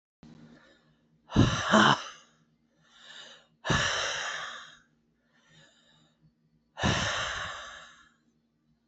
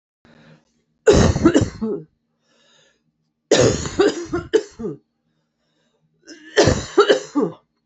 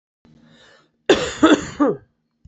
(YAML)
exhalation_length: 8.9 s
exhalation_amplitude: 15751
exhalation_signal_mean_std_ratio: 0.38
three_cough_length: 7.9 s
three_cough_amplitude: 30220
three_cough_signal_mean_std_ratio: 0.41
cough_length: 2.5 s
cough_amplitude: 28236
cough_signal_mean_std_ratio: 0.37
survey_phase: beta (2021-08-13 to 2022-03-07)
age: 45-64
gender: Female
wearing_mask: 'No'
symptom_cough_any: true
symptom_new_continuous_cough: true
symptom_runny_or_blocked_nose: true
symptom_shortness_of_breath: true
symptom_abdominal_pain: true
symptom_fatigue: true
symptom_headache: true
symptom_change_to_sense_of_smell_or_taste: true
symptom_loss_of_taste: true
symptom_onset: 2 days
smoker_status: Never smoked
respiratory_condition_asthma: false
respiratory_condition_other: false
recruitment_source: Test and Trace
submission_delay: 1 day
covid_test_result: Positive
covid_test_method: RT-qPCR
covid_ct_value: 17.3
covid_ct_gene: ORF1ab gene